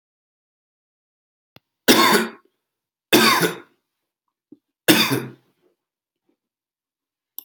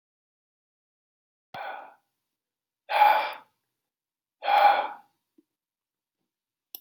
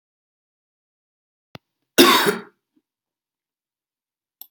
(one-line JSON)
{"three_cough_length": "7.4 s", "three_cough_amplitude": 32768, "three_cough_signal_mean_std_ratio": 0.3, "exhalation_length": "6.8 s", "exhalation_amplitude": 13855, "exhalation_signal_mean_std_ratio": 0.29, "cough_length": "4.5 s", "cough_amplitude": 32655, "cough_signal_mean_std_ratio": 0.22, "survey_phase": "beta (2021-08-13 to 2022-03-07)", "age": "18-44", "gender": "Male", "wearing_mask": "No", "symptom_cough_any": true, "smoker_status": "Never smoked", "respiratory_condition_asthma": false, "respiratory_condition_other": false, "recruitment_source": "REACT", "submission_delay": "1 day", "covid_test_result": "Negative", "covid_test_method": "RT-qPCR"}